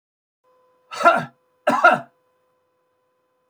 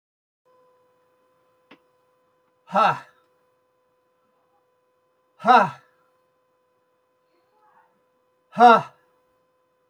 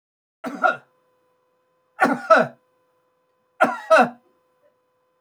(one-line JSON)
{"cough_length": "3.5 s", "cough_amplitude": 27631, "cough_signal_mean_std_ratio": 0.29, "exhalation_length": "9.9 s", "exhalation_amplitude": 25766, "exhalation_signal_mean_std_ratio": 0.21, "three_cough_length": "5.2 s", "three_cough_amplitude": 26691, "three_cough_signal_mean_std_ratio": 0.31, "survey_phase": "beta (2021-08-13 to 2022-03-07)", "age": "45-64", "gender": "Male", "wearing_mask": "No", "symptom_none": true, "smoker_status": "Never smoked", "respiratory_condition_asthma": false, "respiratory_condition_other": false, "recruitment_source": "REACT", "submission_delay": "2 days", "covid_test_result": "Negative", "covid_test_method": "RT-qPCR"}